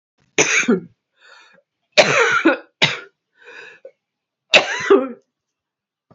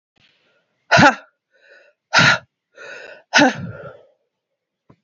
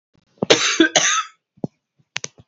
{"three_cough_length": "6.1 s", "three_cough_amplitude": 31770, "three_cough_signal_mean_std_ratio": 0.39, "exhalation_length": "5.0 s", "exhalation_amplitude": 30470, "exhalation_signal_mean_std_ratio": 0.32, "cough_length": "2.5 s", "cough_amplitude": 32768, "cough_signal_mean_std_ratio": 0.4, "survey_phase": "beta (2021-08-13 to 2022-03-07)", "age": "45-64", "gender": "Female", "wearing_mask": "No", "symptom_cough_any": true, "symptom_new_continuous_cough": true, "symptom_runny_or_blocked_nose": true, "symptom_sore_throat": true, "symptom_abdominal_pain": true, "symptom_fatigue": true, "symptom_headache": true, "smoker_status": "Never smoked", "respiratory_condition_asthma": false, "respiratory_condition_other": false, "recruitment_source": "Test and Trace", "submission_delay": "2 days", "covid_test_result": "Positive", "covid_test_method": "RT-qPCR", "covid_ct_value": 25.1, "covid_ct_gene": "ORF1ab gene", "covid_ct_mean": 25.9, "covid_viral_load": "3200 copies/ml", "covid_viral_load_category": "Minimal viral load (< 10K copies/ml)"}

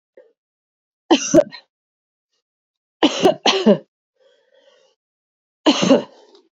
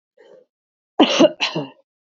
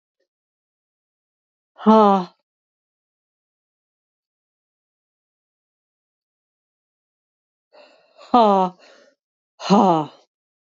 {"three_cough_length": "6.6 s", "three_cough_amplitude": 28301, "three_cough_signal_mean_std_ratio": 0.32, "cough_length": "2.1 s", "cough_amplitude": 26597, "cough_signal_mean_std_ratio": 0.34, "exhalation_length": "10.8 s", "exhalation_amplitude": 27398, "exhalation_signal_mean_std_ratio": 0.24, "survey_phase": "beta (2021-08-13 to 2022-03-07)", "age": "45-64", "gender": "Female", "wearing_mask": "No", "symptom_none": true, "smoker_status": "Never smoked", "respiratory_condition_asthma": false, "respiratory_condition_other": false, "recruitment_source": "REACT", "submission_delay": "14 days", "covid_test_result": "Negative", "covid_test_method": "RT-qPCR", "influenza_a_test_result": "Negative", "influenza_b_test_result": "Negative"}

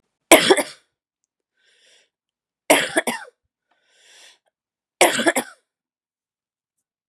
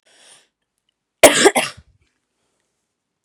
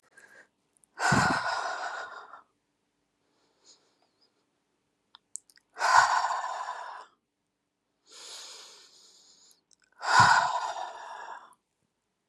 {"three_cough_length": "7.1 s", "three_cough_amplitude": 32768, "three_cough_signal_mean_std_ratio": 0.26, "cough_length": "3.2 s", "cough_amplitude": 32768, "cough_signal_mean_std_ratio": 0.24, "exhalation_length": "12.3 s", "exhalation_amplitude": 18656, "exhalation_signal_mean_std_ratio": 0.36, "survey_phase": "beta (2021-08-13 to 2022-03-07)", "age": "45-64", "gender": "Female", "wearing_mask": "No", "symptom_none": true, "symptom_onset": "9 days", "smoker_status": "Never smoked", "respiratory_condition_asthma": false, "respiratory_condition_other": false, "recruitment_source": "REACT", "submission_delay": "1 day", "covid_test_result": "Negative", "covid_test_method": "RT-qPCR", "influenza_a_test_result": "Negative", "influenza_b_test_result": "Negative"}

